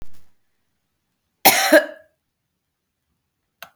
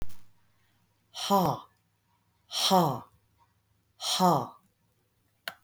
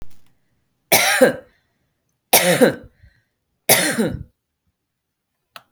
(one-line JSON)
{"cough_length": "3.8 s", "cough_amplitude": 32768, "cough_signal_mean_std_ratio": 0.26, "exhalation_length": "5.6 s", "exhalation_amplitude": 10476, "exhalation_signal_mean_std_ratio": 0.41, "three_cough_length": "5.7 s", "three_cough_amplitude": 32768, "three_cough_signal_mean_std_ratio": 0.37, "survey_phase": "beta (2021-08-13 to 2022-03-07)", "age": "45-64", "gender": "Female", "wearing_mask": "No", "symptom_none": true, "smoker_status": "Ex-smoker", "respiratory_condition_asthma": false, "respiratory_condition_other": false, "recruitment_source": "REACT", "submission_delay": "2 days", "covid_test_result": "Negative", "covid_test_method": "RT-qPCR", "influenza_a_test_result": "Negative", "influenza_b_test_result": "Negative"}